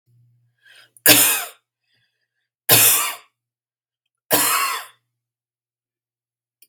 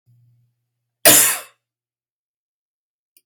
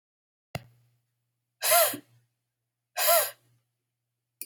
{"three_cough_length": "6.7 s", "three_cough_amplitude": 32768, "three_cough_signal_mean_std_ratio": 0.33, "cough_length": "3.3 s", "cough_amplitude": 32768, "cough_signal_mean_std_ratio": 0.24, "exhalation_length": "4.5 s", "exhalation_amplitude": 12109, "exhalation_signal_mean_std_ratio": 0.31, "survey_phase": "beta (2021-08-13 to 2022-03-07)", "age": "18-44", "gender": "Female", "wearing_mask": "No", "symptom_cough_any": true, "symptom_runny_or_blocked_nose": true, "symptom_sore_throat": true, "symptom_fatigue": true, "symptom_onset": "13 days", "smoker_status": "Never smoked", "respiratory_condition_asthma": false, "respiratory_condition_other": false, "recruitment_source": "REACT", "submission_delay": "1 day", "covid_test_result": "Negative", "covid_test_method": "RT-qPCR", "influenza_a_test_result": "Negative", "influenza_b_test_result": "Negative"}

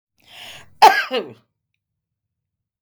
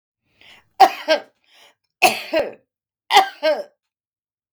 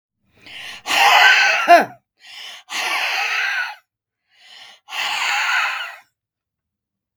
{"cough_length": "2.8 s", "cough_amplitude": 32766, "cough_signal_mean_std_ratio": 0.24, "three_cough_length": "4.5 s", "three_cough_amplitude": 32768, "three_cough_signal_mean_std_ratio": 0.33, "exhalation_length": "7.2 s", "exhalation_amplitude": 32768, "exhalation_signal_mean_std_ratio": 0.5, "survey_phase": "beta (2021-08-13 to 2022-03-07)", "age": "65+", "gender": "Female", "wearing_mask": "No", "symptom_none": true, "smoker_status": "Ex-smoker", "respiratory_condition_asthma": false, "respiratory_condition_other": false, "recruitment_source": "REACT", "submission_delay": "9 days", "covid_test_result": "Negative", "covid_test_method": "RT-qPCR", "influenza_a_test_result": "Negative", "influenza_b_test_result": "Negative"}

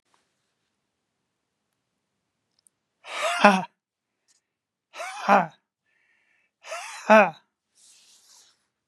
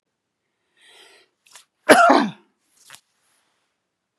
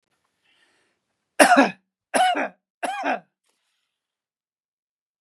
{"exhalation_length": "8.9 s", "exhalation_amplitude": 32767, "exhalation_signal_mean_std_ratio": 0.23, "cough_length": "4.2 s", "cough_amplitude": 32768, "cough_signal_mean_std_ratio": 0.24, "three_cough_length": "5.2 s", "three_cough_amplitude": 32592, "three_cough_signal_mean_std_ratio": 0.3, "survey_phase": "beta (2021-08-13 to 2022-03-07)", "age": "65+", "gender": "Male", "wearing_mask": "No", "symptom_none": true, "smoker_status": "Ex-smoker", "respiratory_condition_asthma": false, "respiratory_condition_other": false, "recruitment_source": "REACT", "submission_delay": "2 days", "covid_test_result": "Negative", "covid_test_method": "RT-qPCR", "influenza_a_test_result": "Negative", "influenza_b_test_result": "Negative"}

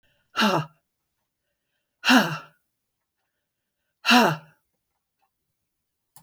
{"exhalation_length": "6.2 s", "exhalation_amplitude": 21422, "exhalation_signal_mean_std_ratio": 0.28, "survey_phase": "beta (2021-08-13 to 2022-03-07)", "age": "65+", "gender": "Female", "wearing_mask": "No", "symptom_none": true, "smoker_status": "Never smoked", "respiratory_condition_asthma": false, "respiratory_condition_other": false, "recruitment_source": "REACT", "submission_delay": "4 days", "covid_test_result": "Negative", "covid_test_method": "RT-qPCR"}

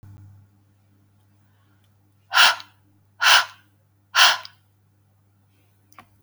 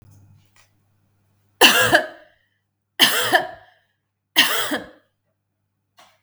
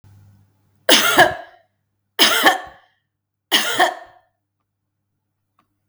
{"exhalation_length": "6.2 s", "exhalation_amplitude": 30722, "exhalation_signal_mean_std_ratio": 0.27, "three_cough_length": "6.2 s", "three_cough_amplitude": 32768, "three_cough_signal_mean_std_ratio": 0.34, "cough_length": "5.9 s", "cough_amplitude": 32768, "cough_signal_mean_std_ratio": 0.36, "survey_phase": "beta (2021-08-13 to 2022-03-07)", "age": "45-64", "gender": "Female", "wearing_mask": "No", "symptom_none": true, "smoker_status": "Ex-smoker", "respiratory_condition_asthma": false, "respiratory_condition_other": false, "recruitment_source": "REACT", "submission_delay": "0 days", "covid_test_result": "Negative", "covid_test_method": "RT-qPCR", "influenza_a_test_result": "Negative", "influenza_b_test_result": "Negative"}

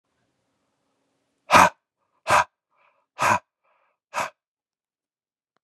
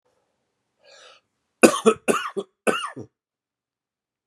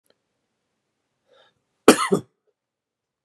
{"exhalation_length": "5.6 s", "exhalation_amplitude": 32084, "exhalation_signal_mean_std_ratio": 0.24, "three_cough_length": "4.3 s", "three_cough_amplitude": 32768, "three_cough_signal_mean_std_ratio": 0.26, "cough_length": "3.2 s", "cough_amplitude": 32768, "cough_signal_mean_std_ratio": 0.17, "survey_phase": "beta (2021-08-13 to 2022-03-07)", "age": "45-64", "gender": "Male", "wearing_mask": "No", "symptom_runny_or_blocked_nose": true, "symptom_fatigue": true, "symptom_headache": true, "symptom_onset": "4 days", "smoker_status": "Ex-smoker", "respiratory_condition_asthma": false, "respiratory_condition_other": false, "recruitment_source": "Test and Trace", "submission_delay": "1 day", "covid_test_result": "Positive", "covid_test_method": "RT-qPCR"}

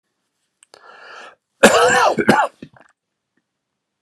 {"cough_length": "4.0 s", "cough_amplitude": 32768, "cough_signal_mean_std_ratio": 0.36, "survey_phase": "alpha (2021-03-01 to 2021-08-12)", "age": "65+", "gender": "Male", "wearing_mask": "No", "symptom_none": true, "smoker_status": "Ex-smoker", "respiratory_condition_asthma": false, "respiratory_condition_other": false, "recruitment_source": "REACT", "submission_delay": "2 days", "covid_test_result": "Negative", "covid_test_method": "RT-qPCR"}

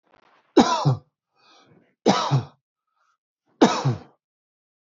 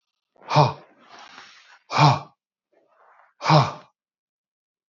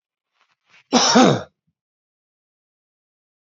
{"three_cough_length": "4.9 s", "three_cough_amplitude": 32548, "three_cough_signal_mean_std_ratio": 0.34, "exhalation_length": "4.9 s", "exhalation_amplitude": 26795, "exhalation_signal_mean_std_ratio": 0.3, "cough_length": "3.4 s", "cough_amplitude": 28165, "cough_signal_mean_std_ratio": 0.29, "survey_phase": "alpha (2021-03-01 to 2021-08-12)", "age": "45-64", "gender": "Male", "wearing_mask": "No", "symptom_none": true, "smoker_status": "Ex-smoker", "respiratory_condition_asthma": false, "respiratory_condition_other": false, "recruitment_source": "REACT", "submission_delay": "1 day", "covid_test_result": "Negative", "covid_test_method": "RT-qPCR"}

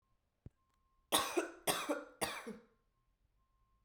{"three_cough_length": "3.8 s", "three_cough_amplitude": 5713, "three_cough_signal_mean_std_ratio": 0.38, "survey_phase": "beta (2021-08-13 to 2022-03-07)", "age": "18-44", "gender": "Female", "wearing_mask": "No", "symptom_cough_any": true, "symptom_runny_or_blocked_nose": true, "symptom_sore_throat": true, "symptom_onset": "3 days", "smoker_status": "Never smoked", "respiratory_condition_asthma": false, "respiratory_condition_other": false, "recruitment_source": "Test and Trace", "submission_delay": "1 day", "covid_test_result": "Positive", "covid_test_method": "RT-qPCR", "covid_ct_value": 17.8, "covid_ct_gene": "ORF1ab gene"}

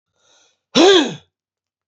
{"cough_length": "1.9 s", "cough_amplitude": 32767, "cough_signal_mean_std_ratio": 0.36, "survey_phase": "alpha (2021-03-01 to 2021-08-12)", "age": "65+", "gender": "Male", "wearing_mask": "No", "symptom_none": true, "smoker_status": "Ex-smoker", "respiratory_condition_asthma": false, "respiratory_condition_other": false, "recruitment_source": "REACT", "submission_delay": "1 day", "covid_test_result": "Negative", "covid_test_method": "RT-qPCR"}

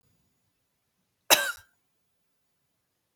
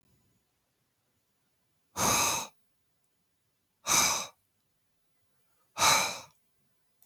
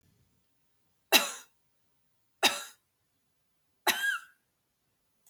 {"cough_length": "3.2 s", "cough_amplitude": 22058, "cough_signal_mean_std_ratio": 0.17, "exhalation_length": "7.1 s", "exhalation_amplitude": 10726, "exhalation_signal_mean_std_ratio": 0.33, "three_cough_length": "5.3 s", "three_cough_amplitude": 18731, "three_cough_signal_mean_std_ratio": 0.25, "survey_phase": "beta (2021-08-13 to 2022-03-07)", "age": "45-64", "gender": "Female", "wearing_mask": "No", "symptom_none": true, "smoker_status": "Ex-smoker", "respiratory_condition_asthma": false, "respiratory_condition_other": false, "recruitment_source": "REACT", "submission_delay": "2 days", "covid_test_result": "Negative", "covid_test_method": "RT-qPCR"}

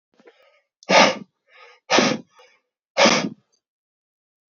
{"exhalation_length": "4.5 s", "exhalation_amplitude": 28067, "exhalation_signal_mean_std_ratio": 0.33, "survey_phase": "alpha (2021-03-01 to 2021-08-12)", "age": "18-44", "gender": "Male", "wearing_mask": "No", "symptom_fever_high_temperature": true, "smoker_status": "Current smoker (e-cigarettes or vapes only)", "respiratory_condition_asthma": false, "respiratory_condition_other": false, "recruitment_source": "Test and Trace", "submission_delay": "1 day", "covid_test_result": "Positive", "covid_test_method": "RT-qPCR", "covid_ct_value": 14.8, "covid_ct_gene": "ORF1ab gene", "covid_ct_mean": 15.4, "covid_viral_load": "8700000 copies/ml", "covid_viral_load_category": "High viral load (>1M copies/ml)"}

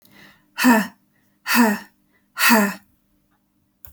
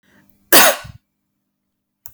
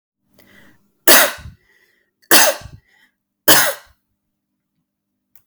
{"exhalation_length": "3.9 s", "exhalation_amplitude": 28392, "exhalation_signal_mean_std_ratio": 0.4, "cough_length": "2.1 s", "cough_amplitude": 32768, "cough_signal_mean_std_ratio": 0.27, "three_cough_length": "5.5 s", "three_cough_amplitude": 32768, "three_cough_signal_mean_std_ratio": 0.29, "survey_phase": "alpha (2021-03-01 to 2021-08-12)", "age": "18-44", "gender": "Female", "wearing_mask": "No", "symptom_none": true, "smoker_status": "Never smoked", "respiratory_condition_asthma": false, "respiratory_condition_other": false, "recruitment_source": "REACT", "submission_delay": "3 days", "covid_test_result": "Negative", "covid_test_method": "RT-qPCR"}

